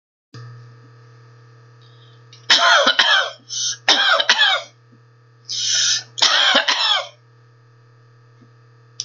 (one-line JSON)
{"three_cough_length": "9.0 s", "three_cough_amplitude": 30882, "three_cough_signal_mean_std_ratio": 0.49, "survey_phase": "beta (2021-08-13 to 2022-03-07)", "age": "45-64", "gender": "Female", "wearing_mask": "No", "symptom_none": true, "symptom_onset": "10 days", "smoker_status": "Ex-smoker", "respiratory_condition_asthma": false, "respiratory_condition_other": false, "recruitment_source": "REACT", "submission_delay": "0 days", "covid_test_result": "Negative", "covid_test_method": "RT-qPCR", "influenza_a_test_result": "Negative", "influenza_b_test_result": "Negative"}